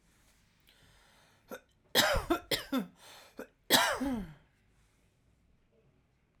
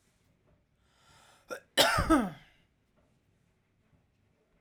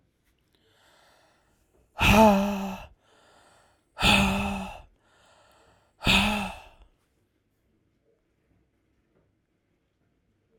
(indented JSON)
{
  "three_cough_length": "6.4 s",
  "three_cough_amplitude": 12152,
  "three_cough_signal_mean_std_ratio": 0.35,
  "cough_length": "4.6 s",
  "cough_amplitude": 11700,
  "cough_signal_mean_std_ratio": 0.28,
  "exhalation_length": "10.6 s",
  "exhalation_amplitude": 17458,
  "exhalation_signal_mean_std_ratio": 0.32,
  "survey_phase": "alpha (2021-03-01 to 2021-08-12)",
  "age": "18-44",
  "gender": "Female",
  "wearing_mask": "No",
  "symptom_none": true,
  "smoker_status": "Ex-smoker",
  "respiratory_condition_asthma": true,
  "respiratory_condition_other": false,
  "recruitment_source": "REACT",
  "submission_delay": "1 day",
  "covid_test_result": "Negative",
  "covid_test_method": "RT-qPCR"
}